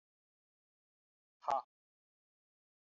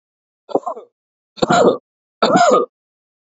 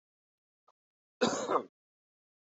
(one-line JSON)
{"exhalation_length": "2.8 s", "exhalation_amplitude": 2358, "exhalation_signal_mean_std_ratio": 0.16, "three_cough_length": "3.3 s", "three_cough_amplitude": 28022, "three_cough_signal_mean_std_ratio": 0.43, "cough_length": "2.6 s", "cough_amplitude": 5766, "cough_signal_mean_std_ratio": 0.29, "survey_phase": "beta (2021-08-13 to 2022-03-07)", "age": "18-44", "gender": "Male", "wearing_mask": "No", "symptom_cough_any": true, "symptom_fatigue": true, "symptom_headache": true, "symptom_onset": "3 days", "smoker_status": "Ex-smoker", "respiratory_condition_asthma": false, "respiratory_condition_other": false, "recruitment_source": "Test and Trace", "submission_delay": "2 days", "covid_test_result": "Positive", "covid_test_method": "RT-qPCR", "covid_ct_value": 27.8, "covid_ct_gene": "ORF1ab gene", "covid_ct_mean": 28.2, "covid_viral_load": "570 copies/ml", "covid_viral_load_category": "Minimal viral load (< 10K copies/ml)"}